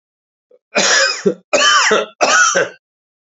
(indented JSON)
{
  "three_cough_length": "3.2 s",
  "three_cough_amplitude": 32767,
  "three_cough_signal_mean_std_ratio": 0.62,
  "survey_phase": "beta (2021-08-13 to 2022-03-07)",
  "age": "45-64",
  "gender": "Male",
  "wearing_mask": "No",
  "symptom_cough_any": true,
  "symptom_runny_or_blocked_nose": true,
  "symptom_sore_throat": true,
  "symptom_fatigue": true,
  "symptom_fever_high_temperature": true,
  "symptom_headache": true,
  "smoker_status": "Ex-smoker",
  "respiratory_condition_asthma": true,
  "respiratory_condition_other": false,
  "recruitment_source": "Test and Trace",
  "submission_delay": "1 day",
  "covid_test_result": "Positive",
  "covid_test_method": "LFT"
}